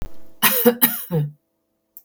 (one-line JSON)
{"cough_length": "2.0 s", "cough_amplitude": 32768, "cough_signal_mean_std_ratio": 0.52, "survey_phase": "beta (2021-08-13 to 2022-03-07)", "age": "45-64", "gender": "Female", "wearing_mask": "No", "symptom_none": true, "smoker_status": "Never smoked", "respiratory_condition_asthma": false, "respiratory_condition_other": false, "recruitment_source": "REACT", "submission_delay": "1 day", "covid_test_result": "Negative", "covid_test_method": "RT-qPCR", "influenza_a_test_result": "Unknown/Void", "influenza_b_test_result": "Unknown/Void"}